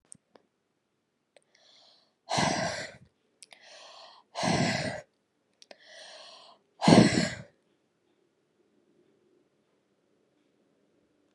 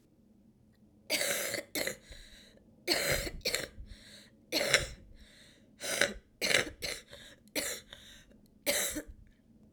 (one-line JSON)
{"exhalation_length": "11.3 s", "exhalation_amplitude": 25771, "exhalation_signal_mean_std_ratio": 0.27, "cough_length": "9.7 s", "cough_amplitude": 18446, "cough_signal_mean_std_ratio": 0.47, "survey_phase": "alpha (2021-03-01 to 2021-08-12)", "age": "18-44", "gender": "Female", "wearing_mask": "No", "symptom_cough_any": true, "symptom_shortness_of_breath": true, "symptom_diarrhoea": true, "symptom_fever_high_temperature": true, "symptom_headache": true, "symptom_loss_of_taste": true, "symptom_onset": "3 days", "smoker_status": "Never smoked", "respiratory_condition_asthma": false, "respiratory_condition_other": false, "recruitment_source": "Test and Trace", "submission_delay": "2 days", "covid_test_result": "Positive", "covid_test_method": "RT-qPCR", "covid_ct_value": 13.9, "covid_ct_gene": "ORF1ab gene", "covid_ct_mean": 14.1, "covid_viral_load": "23000000 copies/ml", "covid_viral_load_category": "High viral load (>1M copies/ml)"}